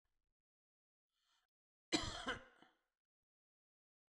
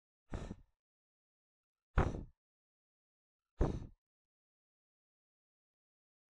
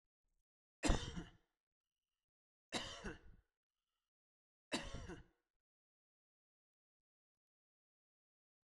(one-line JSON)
{"cough_length": "4.1 s", "cough_amplitude": 2480, "cough_signal_mean_std_ratio": 0.23, "exhalation_length": "6.3 s", "exhalation_amplitude": 5137, "exhalation_signal_mean_std_ratio": 0.21, "three_cough_length": "8.6 s", "three_cough_amplitude": 2901, "three_cough_signal_mean_std_ratio": 0.22, "survey_phase": "beta (2021-08-13 to 2022-03-07)", "age": "45-64", "gender": "Male", "wearing_mask": "No", "symptom_none": true, "smoker_status": "Never smoked", "respiratory_condition_asthma": false, "respiratory_condition_other": false, "recruitment_source": "REACT", "submission_delay": "7 days", "covid_test_result": "Negative", "covid_test_method": "RT-qPCR", "influenza_a_test_result": "Unknown/Void", "influenza_b_test_result": "Unknown/Void"}